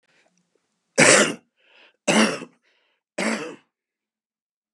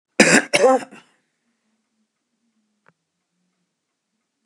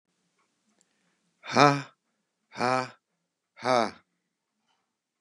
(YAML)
three_cough_length: 4.7 s
three_cough_amplitude: 31085
three_cough_signal_mean_std_ratio: 0.32
cough_length: 4.5 s
cough_amplitude: 32767
cough_signal_mean_std_ratio: 0.26
exhalation_length: 5.2 s
exhalation_amplitude: 27457
exhalation_signal_mean_std_ratio: 0.25
survey_phase: beta (2021-08-13 to 2022-03-07)
age: 65+
gender: Male
wearing_mask: 'No'
symptom_shortness_of_breath: true
symptom_other: true
symptom_onset: 12 days
smoker_status: Ex-smoker
respiratory_condition_asthma: false
respiratory_condition_other: false
recruitment_source: REACT
submission_delay: 2 days
covid_test_result: Positive
covid_test_method: RT-qPCR
covid_ct_value: 30.0
covid_ct_gene: E gene
influenza_a_test_result: Negative
influenza_b_test_result: Negative